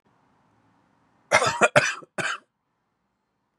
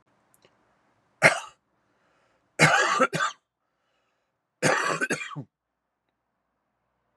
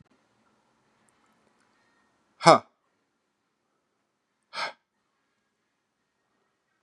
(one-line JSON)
{"cough_length": "3.6 s", "cough_amplitude": 26543, "cough_signal_mean_std_ratio": 0.31, "three_cough_length": "7.2 s", "three_cough_amplitude": 27678, "three_cough_signal_mean_std_ratio": 0.33, "exhalation_length": "6.8 s", "exhalation_amplitude": 32499, "exhalation_signal_mean_std_ratio": 0.11, "survey_phase": "beta (2021-08-13 to 2022-03-07)", "age": "18-44", "gender": "Male", "wearing_mask": "No", "symptom_runny_or_blocked_nose": true, "symptom_headache": true, "symptom_change_to_sense_of_smell_or_taste": true, "symptom_onset": "3 days", "smoker_status": "Ex-smoker", "respiratory_condition_asthma": false, "respiratory_condition_other": false, "recruitment_source": "Test and Trace", "submission_delay": "2 days", "covid_test_result": "Positive", "covid_test_method": "RT-qPCR", "covid_ct_value": 14.0, "covid_ct_gene": "ORF1ab gene", "covid_ct_mean": 14.1, "covid_viral_load": "24000000 copies/ml", "covid_viral_load_category": "High viral load (>1M copies/ml)"}